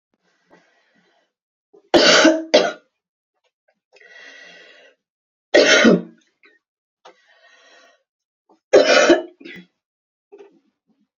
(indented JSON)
{
  "three_cough_length": "11.2 s",
  "three_cough_amplitude": 32767,
  "three_cough_signal_mean_std_ratio": 0.31,
  "survey_phase": "beta (2021-08-13 to 2022-03-07)",
  "age": "18-44",
  "gender": "Female",
  "wearing_mask": "No",
  "symptom_cough_any": true,
  "symptom_runny_or_blocked_nose": true,
  "symptom_sore_throat": true,
  "symptom_fever_high_temperature": true,
  "symptom_headache": true,
  "symptom_onset": "2 days",
  "smoker_status": "Never smoked",
  "respiratory_condition_asthma": false,
  "respiratory_condition_other": false,
  "recruitment_source": "Test and Trace",
  "submission_delay": "2 days",
  "covid_test_result": "Positive",
  "covid_test_method": "ePCR"
}